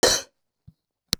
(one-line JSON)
{"cough_length": "1.2 s", "cough_amplitude": 24208, "cough_signal_mean_std_ratio": 0.3, "survey_phase": "beta (2021-08-13 to 2022-03-07)", "age": "45-64", "gender": "Female", "wearing_mask": "No", "symptom_headache": true, "symptom_onset": "9 days", "smoker_status": "Never smoked", "respiratory_condition_asthma": true, "respiratory_condition_other": false, "recruitment_source": "REACT", "submission_delay": "1 day", "covid_test_result": "Negative", "covid_test_method": "RT-qPCR", "influenza_a_test_result": "Negative", "influenza_b_test_result": "Negative"}